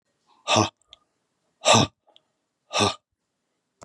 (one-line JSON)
{"exhalation_length": "3.8 s", "exhalation_amplitude": 23694, "exhalation_signal_mean_std_ratio": 0.3, "survey_phase": "beta (2021-08-13 to 2022-03-07)", "age": "45-64", "gender": "Male", "wearing_mask": "No", "symptom_new_continuous_cough": true, "symptom_runny_or_blocked_nose": true, "symptom_onset": "7 days", "smoker_status": "Never smoked", "respiratory_condition_asthma": false, "respiratory_condition_other": false, "recruitment_source": "Test and Trace", "submission_delay": "1 day", "covid_test_result": "Positive", "covid_test_method": "RT-qPCR", "covid_ct_value": 19.0, "covid_ct_gene": "ORF1ab gene"}